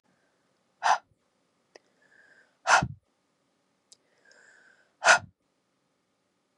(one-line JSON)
{"exhalation_length": "6.6 s", "exhalation_amplitude": 18479, "exhalation_signal_mean_std_ratio": 0.21, "survey_phase": "beta (2021-08-13 to 2022-03-07)", "age": "18-44", "gender": "Female", "wearing_mask": "No", "symptom_runny_or_blocked_nose": true, "symptom_sore_throat": true, "symptom_headache": true, "symptom_onset": "1 day", "smoker_status": "Never smoked", "respiratory_condition_asthma": false, "respiratory_condition_other": false, "recruitment_source": "Test and Trace", "submission_delay": "1 day", "covid_test_result": "Positive", "covid_test_method": "RT-qPCR", "covid_ct_value": 30.7, "covid_ct_gene": "N gene"}